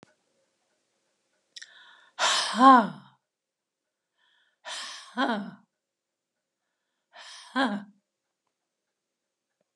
{"exhalation_length": "9.8 s", "exhalation_amplitude": 20457, "exhalation_signal_mean_std_ratio": 0.25, "survey_phase": "beta (2021-08-13 to 2022-03-07)", "age": "65+", "gender": "Female", "wearing_mask": "No", "symptom_none": true, "smoker_status": "Never smoked", "respiratory_condition_asthma": false, "respiratory_condition_other": false, "recruitment_source": "REACT", "submission_delay": "1 day", "covid_test_result": "Negative", "covid_test_method": "RT-qPCR"}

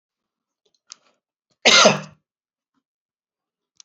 {"cough_length": "3.8 s", "cough_amplitude": 29782, "cough_signal_mean_std_ratio": 0.23, "survey_phase": "beta (2021-08-13 to 2022-03-07)", "age": "65+", "gender": "Male", "wearing_mask": "No", "symptom_none": true, "smoker_status": "Never smoked", "respiratory_condition_asthma": false, "respiratory_condition_other": false, "recruitment_source": "REACT", "submission_delay": "3 days", "covid_test_result": "Negative", "covid_test_method": "RT-qPCR"}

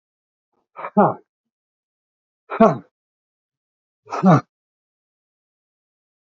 {"exhalation_length": "6.3 s", "exhalation_amplitude": 27615, "exhalation_signal_mean_std_ratio": 0.23, "survey_phase": "beta (2021-08-13 to 2022-03-07)", "age": "65+", "gender": "Male", "wearing_mask": "No", "symptom_none": true, "smoker_status": "Ex-smoker", "respiratory_condition_asthma": false, "respiratory_condition_other": false, "recruitment_source": "REACT", "submission_delay": "1 day", "covid_test_result": "Negative", "covid_test_method": "RT-qPCR", "influenza_a_test_result": "Negative", "influenza_b_test_result": "Negative"}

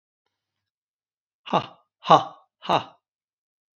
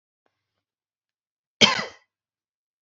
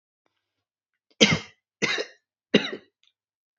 {"exhalation_length": "3.8 s", "exhalation_amplitude": 27433, "exhalation_signal_mean_std_ratio": 0.22, "cough_length": "2.8 s", "cough_amplitude": 32767, "cough_signal_mean_std_ratio": 0.18, "three_cough_length": "3.6 s", "three_cough_amplitude": 27779, "three_cough_signal_mean_std_ratio": 0.26, "survey_phase": "beta (2021-08-13 to 2022-03-07)", "age": "65+", "gender": "Male", "wearing_mask": "No", "symptom_none": true, "smoker_status": "Ex-smoker", "respiratory_condition_asthma": false, "respiratory_condition_other": false, "recruitment_source": "REACT", "submission_delay": "1 day", "covid_test_result": "Negative", "covid_test_method": "RT-qPCR", "influenza_a_test_result": "Negative", "influenza_b_test_result": "Negative"}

